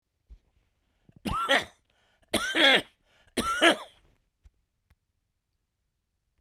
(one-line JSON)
{"three_cough_length": "6.4 s", "three_cough_amplitude": 15860, "three_cough_signal_mean_std_ratio": 0.32, "survey_phase": "beta (2021-08-13 to 2022-03-07)", "age": "65+", "gender": "Male", "wearing_mask": "No", "symptom_shortness_of_breath": true, "smoker_status": "Ex-smoker", "respiratory_condition_asthma": false, "respiratory_condition_other": true, "recruitment_source": "REACT", "submission_delay": "1 day", "covid_test_result": "Negative", "covid_test_method": "RT-qPCR", "influenza_a_test_result": "Negative", "influenza_b_test_result": "Negative"}